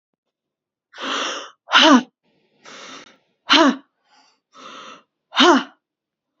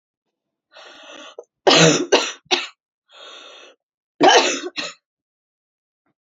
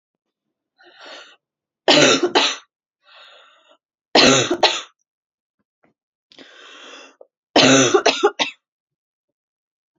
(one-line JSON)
{"exhalation_length": "6.4 s", "exhalation_amplitude": 30658, "exhalation_signal_mean_std_ratio": 0.33, "cough_length": "6.2 s", "cough_amplitude": 31028, "cough_signal_mean_std_ratio": 0.34, "three_cough_length": "10.0 s", "three_cough_amplitude": 32767, "three_cough_signal_mean_std_ratio": 0.35, "survey_phase": "beta (2021-08-13 to 2022-03-07)", "age": "18-44", "gender": "Female", "wearing_mask": "No", "symptom_cough_any": true, "symptom_runny_or_blocked_nose": true, "symptom_shortness_of_breath": true, "symptom_sore_throat": true, "symptom_abdominal_pain": true, "symptom_fatigue": true, "symptom_headache": true, "symptom_other": true, "symptom_onset": "8 days", "smoker_status": "Never smoked", "respiratory_condition_asthma": false, "respiratory_condition_other": false, "recruitment_source": "REACT", "submission_delay": "5 days", "covid_test_result": "Positive", "covid_test_method": "RT-qPCR", "covid_ct_value": 20.6, "covid_ct_gene": "E gene", "influenza_a_test_result": "Negative", "influenza_b_test_result": "Negative"}